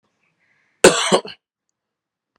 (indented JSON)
{
  "cough_length": "2.4 s",
  "cough_amplitude": 32768,
  "cough_signal_mean_std_ratio": 0.25,
  "survey_phase": "alpha (2021-03-01 to 2021-08-12)",
  "age": "45-64",
  "gender": "Male",
  "wearing_mask": "No",
  "symptom_none": true,
  "smoker_status": "Never smoked",
  "respiratory_condition_asthma": false,
  "respiratory_condition_other": true,
  "recruitment_source": "REACT",
  "submission_delay": "1 day",
  "covid_test_result": "Negative",
  "covid_test_method": "RT-qPCR"
}